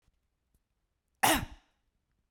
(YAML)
cough_length: 2.3 s
cough_amplitude: 9177
cough_signal_mean_std_ratio: 0.24
survey_phase: beta (2021-08-13 to 2022-03-07)
age: 45-64
gender: Female
wearing_mask: 'No'
symptom_runny_or_blocked_nose: true
symptom_sore_throat: true
symptom_diarrhoea: true
symptom_fatigue: true
symptom_other: true
smoker_status: Never smoked
respiratory_condition_asthma: false
respiratory_condition_other: false
recruitment_source: Test and Trace
submission_delay: 2 days
covid_test_result: Positive
covid_test_method: RT-qPCR
covid_ct_value: 26.8
covid_ct_gene: ORF1ab gene
covid_ct_mean: 27.8
covid_viral_load: 750 copies/ml
covid_viral_load_category: Minimal viral load (< 10K copies/ml)